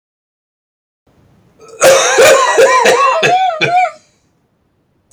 {"cough_length": "5.1 s", "cough_amplitude": 32768, "cough_signal_mean_std_ratio": 0.6, "survey_phase": "beta (2021-08-13 to 2022-03-07)", "age": "45-64", "gender": "Male", "wearing_mask": "No", "symptom_cough_any": true, "symptom_runny_or_blocked_nose": true, "symptom_sore_throat": true, "symptom_onset": "2 days", "smoker_status": "Ex-smoker", "respiratory_condition_asthma": false, "respiratory_condition_other": false, "recruitment_source": "Test and Trace", "submission_delay": "1 day", "covid_test_result": "Positive", "covid_test_method": "RT-qPCR", "covid_ct_value": 33.7, "covid_ct_gene": "N gene"}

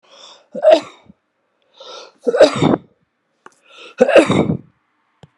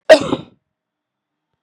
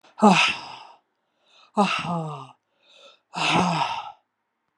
{"three_cough_length": "5.4 s", "three_cough_amplitude": 32768, "three_cough_signal_mean_std_ratio": 0.36, "cough_length": "1.6 s", "cough_amplitude": 32768, "cough_signal_mean_std_ratio": 0.24, "exhalation_length": "4.8 s", "exhalation_amplitude": 21552, "exhalation_signal_mean_std_ratio": 0.44, "survey_phase": "beta (2021-08-13 to 2022-03-07)", "age": "65+", "gender": "Female", "wearing_mask": "No", "symptom_cough_any": true, "symptom_runny_or_blocked_nose": true, "symptom_fatigue": true, "smoker_status": "Ex-smoker", "respiratory_condition_asthma": false, "respiratory_condition_other": false, "recruitment_source": "Test and Trace", "submission_delay": "2 days", "covid_test_result": "Positive", "covid_test_method": "RT-qPCR", "covid_ct_value": 34.5, "covid_ct_gene": "ORF1ab gene", "covid_ct_mean": 35.4, "covid_viral_load": "2.5 copies/ml", "covid_viral_load_category": "Minimal viral load (< 10K copies/ml)"}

